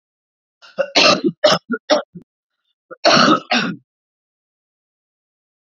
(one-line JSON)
{"cough_length": "5.6 s", "cough_amplitude": 32768, "cough_signal_mean_std_ratio": 0.38, "survey_phase": "beta (2021-08-13 to 2022-03-07)", "age": "45-64", "gender": "Female", "wearing_mask": "No", "symptom_cough_any": true, "symptom_new_continuous_cough": true, "symptom_runny_or_blocked_nose": true, "symptom_sore_throat": true, "symptom_fatigue": true, "symptom_fever_high_temperature": true, "symptom_headache": true, "symptom_onset": "2 days", "smoker_status": "Ex-smoker", "respiratory_condition_asthma": false, "respiratory_condition_other": false, "recruitment_source": "Test and Trace", "submission_delay": "2 days", "covid_test_result": "Positive", "covid_test_method": "RT-qPCR"}